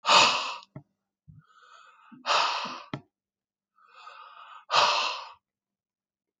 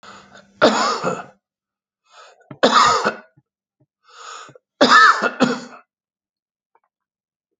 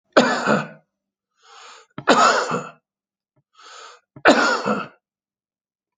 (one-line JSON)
{"exhalation_length": "6.4 s", "exhalation_amplitude": 16519, "exhalation_signal_mean_std_ratio": 0.37, "three_cough_length": "7.6 s", "three_cough_amplitude": 31717, "three_cough_signal_mean_std_ratio": 0.37, "cough_length": "6.0 s", "cough_amplitude": 28131, "cough_signal_mean_std_ratio": 0.4, "survey_phase": "alpha (2021-03-01 to 2021-08-12)", "age": "65+", "gender": "Male", "wearing_mask": "No", "symptom_none": true, "smoker_status": "Ex-smoker", "respiratory_condition_asthma": false, "respiratory_condition_other": false, "recruitment_source": "REACT", "submission_delay": "1 day", "covid_test_result": "Negative", "covid_test_method": "RT-qPCR"}